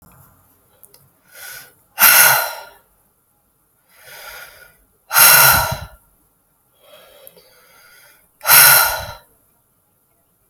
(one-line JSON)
{"exhalation_length": "10.5 s", "exhalation_amplitude": 32768, "exhalation_signal_mean_std_ratio": 0.33, "survey_phase": "alpha (2021-03-01 to 2021-08-12)", "age": "18-44", "gender": "Female", "wearing_mask": "No", "symptom_cough_any": true, "symptom_fatigue": true, "symptom_headache": true, "symptom_onset": "12 days", "smoker_status": "Current smoker (1 to 10 cigarettes per day)", "respiratory_condition_asthma": false, "respiratory_condition_other": false, "recruitment_source": "REACT", "submission_delay": "2 days", "covid_test_result": "Negative", "covid_test_method": "RT-qPCR"}